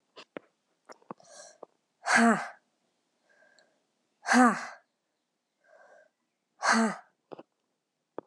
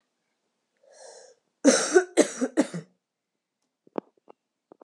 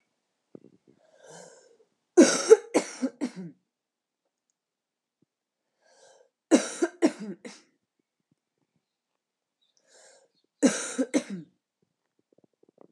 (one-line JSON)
{"exhalation_length": "8.3 s", "exhalation_amplitude": 13394, "exhalation_signal_mean_std_ratio": 0.29, "cough_length": "4.8 s", "cough_amplitude": 20097, "cough_signal_mean_std_ratio": 0.28, "three_cough_length": "12.9 s", "three_cough_amplitude": 23841, "three_cough_signal_mean_std_ratio": 0.22, "survey_phase": "alpha (2021-03-01 to 2021-08-12)", "age": "18-44", "gender": "Female", "wearing_mask": "No", "symptom_cough_any": true, "symptom_fatigue": true, "symptom_headache": true, "symptom_onset": "4 days", "smoker_status": "Never smoked", "respiratory_condition_asthma": false, "respiratory_condition_other": false, "recruitment_source": "Test and Trace", "submission_delay": "2 days", "covid_test_result": "Positive", "covid_test_method": "RT-qPCR"}